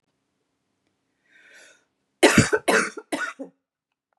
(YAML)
three_cough_length: 4.2 s
three_cough_amplitude: 29797
three_cough_signal_mean_std_ratio: 0.29
survey_phase: beta (2021-08-13 to 2022-03-07)
age: 45-64
gender: Female
wearing_mask: 'No'
symptom_cough_any: true
smoker_status: Never smoked
respiratory_condition_asthma: false
respiratory_condition_other: false
recruitment_source: REACT
submission_delay: 1 day
covid_test_result: Negative
covid_test_method: RT-qPCR